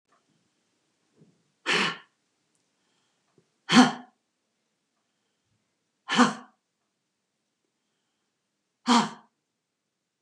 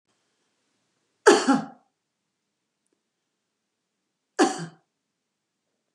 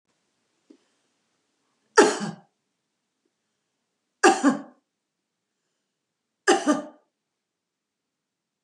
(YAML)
exhalation_length: 10.2 s
exhalation_amplitude: 21398
exhalation_signal_mean_std_ratio: 0.22
cough_length: 5.9 s
cough_amplitude: 26864
cough_signal_mean_std_ratio: 0.21
three_cough_length: 8.6 s
three_cough_amplitude: 25272
three_cough_signal_mean_std_ratio: 0.23
survey_phase: beta (2021-08-13 to 2022-03-07)
age: 65+
gender: Female
wearing_mask: 'No'
symptom_none: true
smoker_status: Never smoked
respiratory_condition_asthma: false
respiratory_condition_other: false
recruitment_source: REACT
submission_delay: 1 day
covid_test_result: Negative
covid_test_method: RT-qPCR
influenza_a_test_result: Negative
influenza_b_test_result: Negative